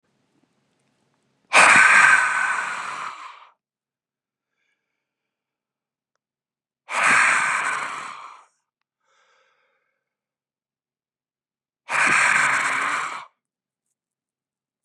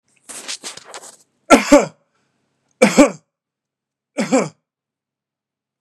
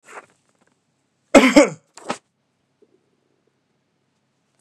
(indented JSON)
{
  "exhalation_length": "14.8 s",
  "exhalation_amplitude": 30615,
  "exhalation_signal_mean_std_ratio": 0.38,
  "three_cough_length": "5.8 s",
  "three_cough_amplitude": 32768,
  "three_cough_signal_mean_std_ratio": 0.28,
  "cough_length": "4.6 s",
  "cough_amplitude": 32768,
  "cough_signal_mean_std_ratio": 0.21,
  "survey_phase": "beta (2021-08-13 to 2022-03-07)",
  "age": "45-64",
  "gender": "Male",
  "wearing_mask": "No",
  "symptom_none": true,
  "smoker_status": "Ex-smoker",
  "respiratory_condition_asthma": false,
  "respiratory_condition_other": false,
  "recruitment_source": "REACT",
  "submission_delay": "1 day",
  "covid_test_result": "Negative",
  "covid_test_method": "RT-qPCR",
  "influenza_a_test_result": "Negative",
  "influenza_b_test_result": "Negative"
}